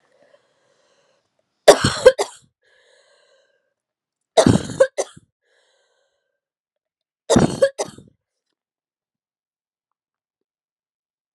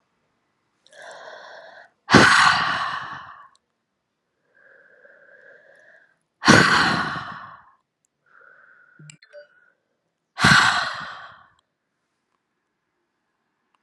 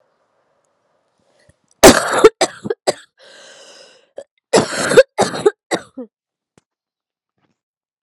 {
  "three_cough_length": "11.3 s",
  "three_cough_amplitude": 32768,
  "three_cough_signal_mean_std_ratio": 0.22,
  "exhalation_length": "13.8 s",
  "exhalation_amplitude": 32457,
  "exhalation_signal_mean_std_ratio": 0.31,
  "cough_length": "8.0 s",
  "cough_amplitude": 32768,
  "cough_signal_mean_std_ratio": 0.28,
  "survey_phase": "alpha (2021-03-01 to 2021-08-12)",
  "age": "18-44",
  "gender": "Female",
  "wearing_mask": "No",
  "symptom_cough_any": true,
  "symptom_new_continuous_cough": true,
  "symptom_shortness_of_breath": true,
  "symptom_fatigue": true,
  "symptom_headache": true,
  "symptom_change_to_sense_of_smell_or_taste": true,
  "symptom_loss_of_taste": true,
  "symptom_onset": "8 days",
  "smoker_status": "Never smoked",
  "respiratory_condition_asthma": false,
  "respiratory_condition_other": false,
  "recruitment_source": "Test and Trace",
  "submission_delay": "1 day",
  "covid_test_result": "Positive",
  "covid_test_method": "RT-qPCR",
  "covid_ct_value": 16.0,
  "covid_ct_gene": "ORF1ab gene",
  "covid_ct_mean": 16.4,
  "covid_viral_load": "4300000 copies/ml",
  "covid_viral_load_category": "High viral load (>1M copies/ml)"
}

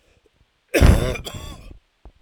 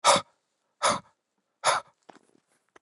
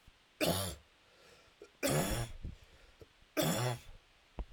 {
  "cough_length": "2.2 s",
  "cough_amplitude": 30377,
  "cough_signal_mean_std_ratio": 0.36,
  "exhalation_length": "2.8 s",
  "exhalation_amplitude": 17167,
  "exhalation_signal_mean_std_ratio": 0.32,
  "three_cough_length": "4.5 s",
  "three_cough_amplitude": 3715,
  "three_cough_signal_mean_std_ratio": 0.51,
  "survey_phase": "alpha (2021-03-01 to 2021-08-12)",
  "age": "45-64",
  "gender": "Male",
  "wearing_mask": "No",
  "symptom_fatigue": true,
  "symptom_headache": true,
  "symptom_change_to_sense_of_smell_or_taste": true,
  "smoker_status": "Never smoked",
  "respiratory_condition_asthma": false,
  "respiratory_condition_other": false,
  "recruitment_source": "Test and Trace",
  "submission_delay": "2 days",
  "covid_test_result": "Positive",
  "covid_test_method": "RT-qPCR"
}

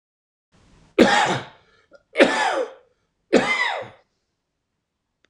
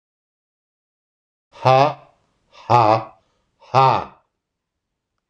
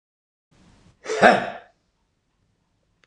{
  "three_cough_length": "5.3 s",
  "three_cough_amplitude": 26028,
  "three_cough_signal_mean_std_ratio": 0.38,
  "exhalation_length": "5.3 s",
  "exhalation_amplitude": 26028,
  "exhalation_signal_mean_std_ratio": 0.32,
  "cough_length": "3.1 s",
  "cough_amplitude": 26027,
  "cough_signal_mean_std_ratio": 0.24,
  "survey_phase": "beta (2021-08-13 to 2022-03-07)",
  "age": "45-64",
  "gender": "Male",
  "wearing_mask": "No",
  "symptom_headache": true,
  "symptom_onset": "6 days",
  "smoker_status": "Ex-smoker",
  "respiratory_condition_asthma": false,
  "respiratory_condition_other": false,
  "recruitment_source": "REACT",
  "submission_delay": "4 days",
  "covid_test_result": "Negative",
  "covid_test_method": "RT-qPCR",
  "influenza_a_test_result": "Negative",
  "influenza_b_test_result": "Negative"
}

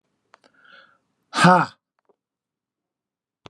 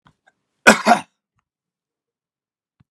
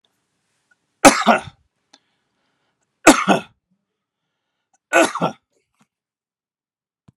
{
  "exhalation_length": "3.5 s",
  "exhalation_amplitude": 29596,
  "exhalation_signal_mean_std_ratio": 0.22,
  "cough_length": "2.9 s",
  "cough_amplitude": 32768,
  "cough_signal_mean_std_ratio": 0.21,
  "three_cough_length": "7.2 s",
  "three_cough_amplitude": 32768,
  "three_cough_signal_mean_std_ratio": 0.24,
  "survey_phase": "beta (2021-08-13 to 2022-03-07)",
  "age": "65+",
  "gender": "Male",
  "wearing_mask": "No",
  "symptom_runny_or_blocked_nose": true,
  "symptom_other": true,
  "smoker_status": "Ex-smoker",
  "respiratory_condition_asthma": false,
  "respiratory_condition_other": false,
  "recruitment_source": "REACT",
  "submission_delay": "2 days",
  "covid_test_result": "Positive",
  "covid_test_method": "RT-qPCR",
  "covid_ct_value": 17.0,
  "covid_ct_gene": "E gene",
  "influenza_a_test_result": "Negative",
  "influenza_b_test_result": "Negative"
}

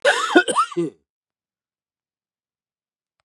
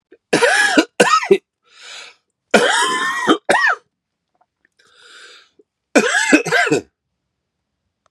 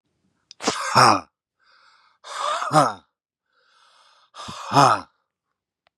{
  "cough_length": "3.2 s",
  "cough_amplitude": 31290,
  "cough_signal_mean_std_ratio": 0.34,
  "three_cough_length": "8.1 s",
  "three_cough_amplitude": 32768,
  "three_cough_signal_mean_std_ratio": 0.47,
  "exhalation_length": "6.0 s",
  "exhalation_amplitude": 31431,
  "exhalation_signal_mean_std_ratio": 0.34,
  "survey_phase": "beta (2021-08-13 to 2022-03-07)",
  "age": "45-64",
  "gender": "Male",
  "wearing_mask": "No",
  "symptom_cough_any": true,
  "symptom_runny_or_blocked_nose": true,
  "symptom_fatigue": true,
  "symptom_fever_high_temperature": true,
  "smoker_status": "Ex-smoker",
  "respiratory_condition_asthma": false,
  "respiratory_condition_other": false,
  "recruitment_source": "Test and Trace",
  "submission_delay": "-1 day",
  "covid_test_result": "Positive",
  "covid_test_method": "LFT"
}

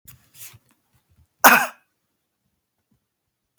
{
  "cough_length": "3.6 s",
  "cough_amplitude": 32768,
  "cough_signal_mean_std_ratio": 0.19,
  "survey_phase": "alpha (2021-03-01 to 2021-08-12)",
  "age": "18-44",
  "gender": "Male",
  "wearing_mask": "No",
  "symptom_fatigue": true,
  "symptom_fever_high_temperature": true,
  "symptom_onset": "3 days",
  "smoker_status": "Never smoked",
  "respiratory_condition_asthma": false,
  "respiratory_condition_other": false,
  "recruitment_source": "Test and Trace",
  "submission_delay": "2 days",
  "covid_ct_value": 26.9,
  "covid_ct_gene": "ORF1ab gene"
}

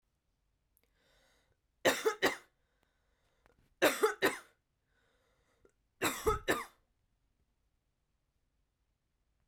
{
  "three_cough_length": "9.5 s",
  "three_cough_amplitude": 7260,
  "three_cough_signal_mean_std_ratio": 0.27,
  "survey_phase": "beta (2021-08-13 to 2022-03-07)",
  "age": "18-44",
  "gender": "Female",
  "wearing_mask": "No",
  "symptom_none": true,
  "smoker_status": "Never smoked",
  "respiratory_condition_asthma": false,
  "respiratory_condition_other": false,
  "recruitment_source": "REACT",
  "submission_delay": "3 days",
  "covid_test_result": "Negative",
  "covid_test_method": "RT-qPCR",
  "influenza_a_test_result": "Negative",
  "influenza_b_test_result": "Negative"
}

